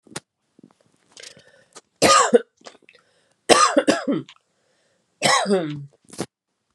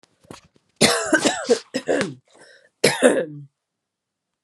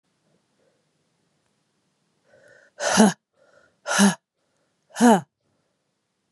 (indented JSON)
{
  "three_cough_length": "6.7 s",
  "three_cough_amplitude": 32767,
  "three_cough_signal_mean_std_ratio": 0.36,
  "cough_length": "4.4 s",
  "cough_amplitude": 30583,
  "cough_signal_mean_std_ratio": 0.42,
  "exhalation_length": "6.3 s",
  "exhalation_amplitude": 27465,
  "exhalation_signal_mean_std_ratio": 0.27,
  "survey_phase": "beta (2021-08-13 to 2022-03-07)",
  "age": "45-64",
  "gender": "Female",
  "wearing_mask": "No",
  "symptom_none": true,
  "smoker_status": "Never smoked",
  "respiratory_condition_asthma": false,
  "respiratory_condition_other": false,
  "recruitment_source": "REACT",
  "submission_delay": "1 day",
  "covid_test_result": "Negative",
  "covid_test_method": "RT-qPCR",
  "influenza_a_test_result": "Negative",
  "influenza_b_test_result": "Negative"
}